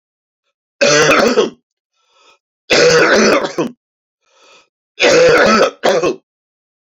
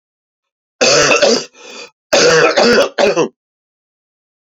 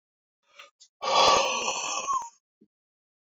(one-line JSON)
{"three_cough_length": "7.0 s", "three_cough_amplitude": 30394, "three_cough_signal_mean_std_ratio": 0.54, "cough_length": "4.4 s", "cough_amplitude": 32768, "cough_signal_mean_std_ratio": 0.55, "exhalation_length": "3.2 s", "exhalation_amplitude": 12964, "exhalation_signal_mean_std_ratio": 0.47, "survey_phase": "beta (2021-08-13 to 2022-03-07)", "age": "45-64", "gender": "Male", "wearing_mask": "No", "symptom_cough_any": true, "symptom_runny_or_blocked_nose": true, "symptom_fever_high_temperature": true, "symptom_onset": "4 days", "smoker_status": "Never smoked", "respiratory_condition_asthma": false, "respiratory_condition_other": false, "recruitment_source": "Test and Trace", "submission_delay": "1 day", "covid_test_result": "Positive", "covid_test_method": "RT-qPCR"}